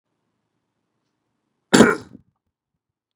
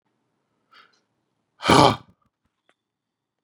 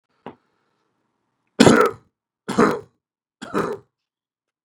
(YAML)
cough_length: 3.2 s
cough_amplitude: 32768
cough_signal_mean_std_ratio: 0.19
exhalation_length: 3.4 s
exhalation_amplitude: 32767
exhalation_signal_mean_std_ratio: 0.21
three_cough_length: 4.6 s
three_cough_amplitude: 32768
three_cough_signal_mean_std_ratio: 0.28
survey_phase: beta (2021-08-13 to 2022-03-07)
age: 45-64
gender: Male
wearing_mask: 'No'
symptom_none: true
smoker_status: Ex-smoker
respiratory_condition_asthma: false
respiratory_condition_other: false
recruitment_source: REACT
submission_delay: 1 day
covid_test_result: Negative
covid_test_method: RT-qPCR
influenza_a_test_result: Negative
influenza_b_test_result: Negative